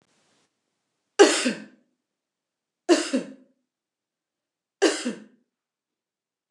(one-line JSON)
{"three_cough_length": "6.5 s", "three_cough_amplitude": 26748, "three_cough_signal_mean_std_ratio": 0.25, "survey_phase": "beta (2021-08-13 to 2022-03-07)", "age": "45-64", "gender": "Female", "wearing_mask": "No", "symptom_fatigue": true, "symptom_headache": true, "smoker_status": "Never smoked", "respiratory_condition_asthma": false, "respiratory_condition_other": false, "recruitment_source": "REACT", "submission_delay": "2 days", "covid_test_result": "Negative", "covid_test_method": "RT-qPCR", "influenza_a_test_result": "Unknown/Void", "influenza_b_test_result": "Unknown/Void"}